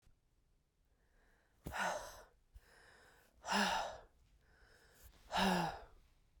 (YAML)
exhalation_length: 6.4 s
exhalation_amplitude: 2935
exhalation_signal_mean_std_ratio: 0.4
survey_phase: beta (2021-08-13 to 2022-03-07)
age: 18-44
gender: Female
wearing_mask: 'No'
symptom_runny_or_blocked_nose: true
symptom_fatigue: true
symptom_fever_high_temperature: true
symptom_headache: true
symptom_other: true
symptom_onset: 5 days
smoker_status: Ex-smoker
respiratory_condition_asthma: false
respiratory_condition_other: false
recruitment_source: Test and Trace
submission_delay: 2 days
covid_test_result: Positive
covid_test_method: RT-qPCR
covid_ct_value: 26.7
covid_ct_gene: N gene